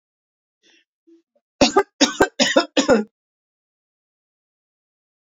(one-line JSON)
{"three_cough_length": "5.2 s", "three_cough_amplitude": 28264, "three_cough_signal_mean_std_ratio": 0.29, "survey_phase": "beta (2021-08-13 to 2022-03-07)", "age": "45-64", "gender": "Female", "wearing_mask": "No", "symptom_cough_any": true, "symptom_sore_throat": true, "symptom_diarrhoea": true, "symptom_fatigue": true, "symptom_fever_high_temperature": true, "symptom_headache": true, "symptom_change_to_sense_of_smell_or_taste": true, "symptom_loss_of_taste": true, "symptom_onset": "4 days", "smoker_status": "Never smoked", "respiratory_condition_asthma": false, "respiratory_condition_other": false, "recruitment_source": "Test and Trace", "submission_delay": "1 day", "covid_test_result": "Positive", "covid_test_method": "RT-qPCR", "covid_ct_value": 22.3, "covid_ct_gene": "ORF1ab gene"}